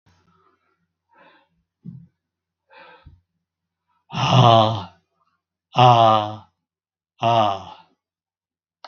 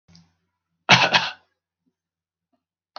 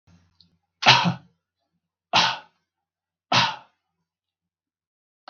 {"exhalation_length": "8.9 s", "exhalation_amplitude": 32768, "exhalation_signal_mean_std_ratio": 0.32, "cough_length": "3.0 s", "cough_amplitude": 32768, "cough_signal_mean_std_ratio": 0.25, "three_cough_length": "5.3 s", "three_cough_amplitude": 32768, "three_cough_signal_mean_std_ratio": 0.28, "survey_phase": "beta (2021-08-13 to 2022-03-07)", "age": "65+", "gender": "Male", "wearing_mask": "No", "symptom_runny_or_blocked_nose": true, "smoker_status": "Never smoked", "respiratory_condition_asthma": false, "respiratory_condition_other": false, "recruitment_source": "REACT", "submission_delay": "2 days", "covid_test_result": "Negative", "covid_test_method": "RT-qPCR", "influenza_a_test_result": "Negative", "influenza_b_test_result": "Negative"}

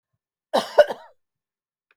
{"cough_length": "2.0 s", "cough_amplitude": 26633, "cough_signal_mean_std_ratio": 0.23, "survey_phase": "beta (2021-08-13 to 2022-03-07)", "age": "45-64", "gender": "Female", "wearing_mask": "No", "symptom_none": true, "smoker_status": "Never smoked", "respiratory_condition_asthma": false, "respiratory_condition_other": false, "recruitment_source": "REACT", "submission_delay": "1 day", "covid_test_result": "Negative", "covid_test_method": "RT-qPCR"}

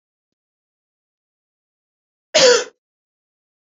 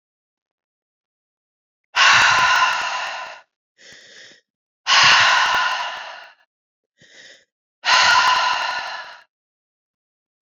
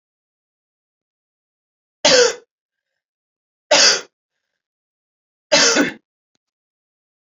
{"cough_length": "3.7 s", "cough_amplitude": 30721, "cough_signal_mean_std_ratio": 0.22, "exhalation_length": "10.4 s", "exhalation_amplitude": 28250, "exhalation_signal_mean_std_ratio": 0.47, "three_cough_length": "7.3 s", "three_cough_amplitude": 32767, "three_cough_signal_mean_std_ratio": 0.29, "survey_phase": "beta (2021-08-13 to 2022-03-07)", "age": "45-64", "gender": "Female", "wearing_mask": "No", "symptom_runny_or_blocked_nose": true, "symptom_fatigue": true, "symptom_headache": true, "smoker_status": "Never smoked", "respiratory_condition_asthma": false, "respiratory_condition_other": false, "recruitment_source": "Test and Trace", "submission_delay": "1 day", "covid_test_result": "Positive", "covid_test_method": "RT-qPCR"}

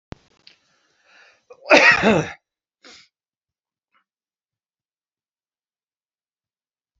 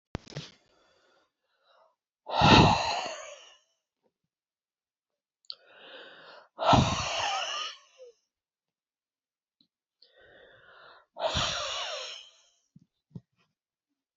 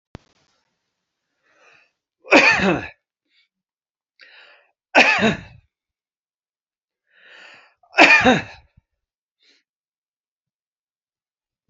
{"cough_length": "7.0 s", "cough_amplitude": 29550, "cough_signal_mean_std_ratio": 0.21, "exhalation_length": "14.2 s", "exhalation_amplitude": 20823, "exhalation_signal_mean_std_ratio": 0.31, "three_cough_length": "11.7 s", "three_cough_amplitude": 32768, "three_cough_signal_mean_std_ratio": 0.26, "survey_phase": "beta (2021-08-13 to 2022-03-07)", "age": "65+", "gender": "Male", "wearing_mask": "No", "symptom_none": true, "smoker_status": "Current smoker (1 to 10 cigarettes per day)", "respiratory_condition_asthma": false, "respiratory_condition_other": false, "recruitment_source": "REACT", "submission_delay": "2 days", "covid_test_result": "Negative", "covid_test_method": "RT-qPCR"}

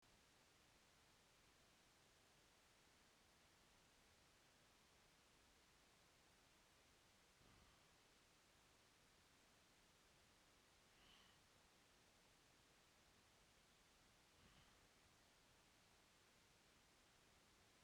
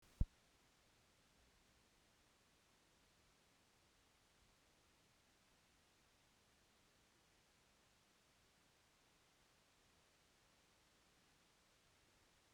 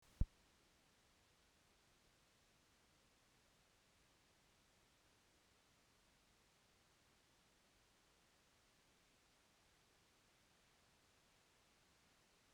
{"exhalation_length": "17.8 s", "exhalation_amplitude": 41, "exhalation_signal_mean_std_ratio": 1.17, "cough_length": "12.5 s", "cough_amplitude": 2115, "cough_signal_mean_std_ratio": 0.16, "three_cough_length": "12.5 s", "three_cough_amplitude": 2116, "three_cough_signal_mean_std_ratio": 0.16, "survey_phase": "beta (2021-08-13 to 2022-03-07)", "age": "65+", "gender": "Female", "wearing_mask": "No", "symptom_cough_any": true, "symptom_fatigue": true, "symptom_fever_high_temperature": true, "symptom_headache": true, "symptom_onset": "5 days", "smoker_status": "Never smoked", "respiratory_condition_asthma": false, "respiratory_condition_other": false, "recruitment_source": "Test and Trace", "submission_delay": "3 days", "covid_test_result": "Positive", "covid_test_method": "RT-qPCR", "covid_ct_value": 18.3, "covid_ct_gene": "ORF1ab gene", "covid_ct_mean": 18.9, "covid_viral_load": "610000 copies/ml", "covid_viral_load_category": "Low viral load (10K-1M copies/ml)"}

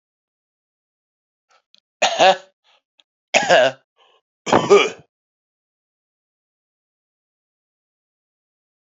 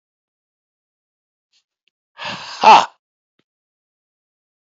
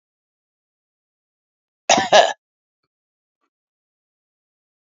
{"three_cough_length": "8.9 s", "three_cough_amplitude": 31750, "three_cough_signal_mean_std_ratio": 0.26, "exhalation_length": "4.6 s", "exhalation_amplitude": 28418, "exhalation_signal_mean_std_ratio": 0.2, "cough_length": "4.9 s", "cough_amplitude": 30189, "cough_signal_mean_std_ratio": 0.19, "survey_phase": "beta (2021-08-13 to 2022-03-07)", "age": "45-64", "gender": "Male", "wearing_mask": "No", "symptom_fatigue": true, "symptom_headache": true, "smoker_status": "Never smoked", "respiratory_condition_asthma": false, "respiratory_condition_other": false, "recruitment_source": "Test and Trace", "submission_delay": "1 day", "covid_test_result": "Positive", "covid_test_method": "ePCR"}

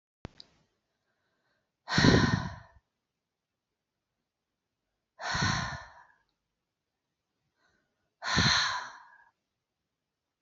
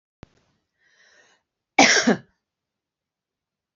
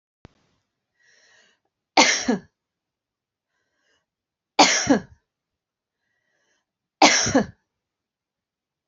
{"exhalation_length": "10.4 s", "exhalation_amplitude": 14684, "exhalation_signal_mean_std_ratio": 0.3, "cough_length": "3.8 s", "cough_amplitude": 32768, "cough_signal_mean_std_ratio": 0.24, "three_cough_length": "8.9 s", "three_cough_amplitude": 31449, "three_cough_signal_mean_std_ratio": 0.26, "survey_phase": "beta (2021-08-13 to 2022-03-07)", "age": "45-64", "gender": "Female", "wearing_mask": "No", "symptom_cough_any": true, "symptom_runny_or_blocked_nose": true, "symptom_sore_throat": true, "symptom_abdominal_pain": true, "symptom_fatigue": true, "symptom_headache": true, "symptom_onset": "2 days", "smoker_status": "Never smoked", "respiratory_condition_asthma": false, "respiratory_condition_other": false, "recruitment_source": "Test and Trace", "submission_delay": "1 day", "covid_test_result": "Positive", "covid_test_method": "LAMP"}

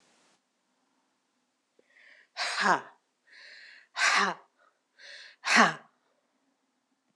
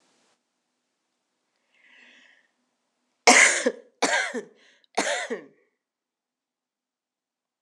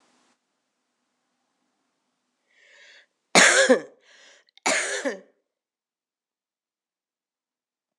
{"exhalation_length": "7.2 s", "exhalation_amplitude": 18206, "exhalation_signal_mean_std_ratio": 0.3, "three_cough_length": "7.6 s", "three_cough_amplitude": 26027, "three_cough_signal_mean_std_ratio": 0.26, "cough_length": "8.0 s", "cough_amplitude": 26028, "cough_signal_mean_std_ratio": 0.24, "survey_phase": "beta (2021-08-13 to 2022-03-07)", "age": "65+", "gender": "Female", "wearing_mask": "No", "symptom_runny_or_blocked_nose": true, "symptom_fatigue": true, "symptom_fever_high_temperature": true, "symptom_headache": true, "symptom_change_to_sense_of_smell_or_taste": true, "symptom_onset": "2 days", "smoker_status": "Never smoked", "respiratory_condition_asthma": false, "respiratory_condition_other": false, "recruitment_source": "Test and Trace", "submission_delay": "1 day", "covid_test_result": "Positive", "covid_test_method": "RT-qPCR", "covid_ct_value": 15.8, "covid_ct_gene": "ORF1ab gene", "covid_ct_mean": 16.2, "covid_viral_load": "5000000 copies/ml", "covid_viral_load_category": "High viral load (>1M copies/ml)"}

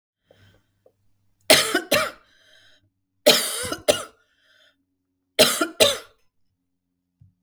{"three_cough_length": "7.4 s", "three_cough_amplitude": 32766, "three_cough_signal_mean_std_ratio": 0.31, "survey_phase": "beta (2021-08-13 to 2022-03-07)", "age": "45-64", "gender": "Female", "wearing_mask": "No", "symptom_none": true, "smoker_status": "Ex-smoker", "respiratory_condition_asthma": false, "respiratory_condition_other": false, "recruitment_source": "REACT", "submission_delay": "1 day", "covid_test_result": "Negative", "covid_test_method": "RT-qPCR", "influenza_a_test_result": "Negative", "influenza_b_test_result": "Negative"}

